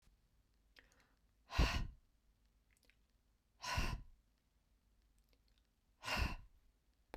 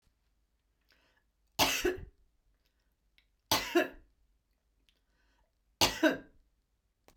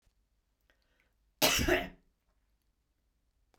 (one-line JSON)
{"exhalation_length": "7.2 s", "exhalation_amplitude": 2608, "exhalation_signal_mean_std_ratio": 0.32, "three_cough_length": "7.2 s", "three_cough_amplitude": 11292, "three_cough_signal_mean_std_ratio": 0.28, "cough_length": "3.6 s", "cough_amplitude": 8238, "cough_signal_mean_std_ratio": 0.28, "survey_phase": "beta (2021-08-13 to 2022-03-07)", "age": "65+", "gender": "Female", "wearing_mask": "No", "symptom_none": true, "smoker_status": "Never smoked", "respiratory_condition_asthma": false, "respiratory_condition_other": false, "recruitment_source": "REACT", "submission_delay": "1 day", "covid_test_result": "Negative", "covid_test_method": "RT-qPCR", "influenza_a_test_result": "Unknown/Void", "influenza_b_test_result": "Unknown/Void"}